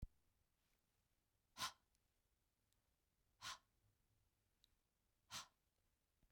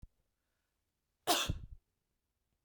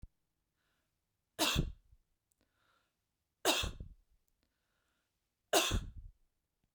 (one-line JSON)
{"exhalation_length": "6.3 s", "exhalation_amplitude": 867, "exhalation_signal_mean_std_ratio": 0.24, "cough_length": "2.6 s", "cough_amplitude": 5754, "cough_signal_mean_std_ratio": 0.27, "three_cough_length": "6.7 s", "three_cough_amplitude": 5868, "three_cough_signal_mean_std_ratio": 0.3, "survey_phase": "beta (2021-08-13 to 2022-03-07)", "age": "45-64", "gender": "Female", "wearing_mask": "No", "symptom_none": true, "smoker_status": "Never smoked", "respiratory_condition_asthma": false, "respiratory_condition_other": false, "recruitment_source": "Test and Trace", "submission_delay": "0 days", "covid_test_result": "Negative", "covid_test_method": "LFT"}